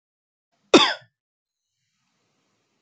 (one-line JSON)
{"cough_length": "2.8 s", "cough_amplitude": 29541, "cough_signal_mean_std_ratio": 0.18, "survey_phase": "beta (2021-08-13 to 2022-03-07)", "age": "18-44", "gender": "Male", "wearing_mask": "No", "symptom_none": true, "smoker_status": "Never smoked", "respiratory_condition_asthma": false, "respiratory_condition_other": false, "recruitment_source": "REACT", "submission_delay": "2 days", "covid_test_result": "Negative", "covid_test_method": "RT-qPCR", "influenza_a_test_result": "Negative", "influenza_b_test_result": "Negative"}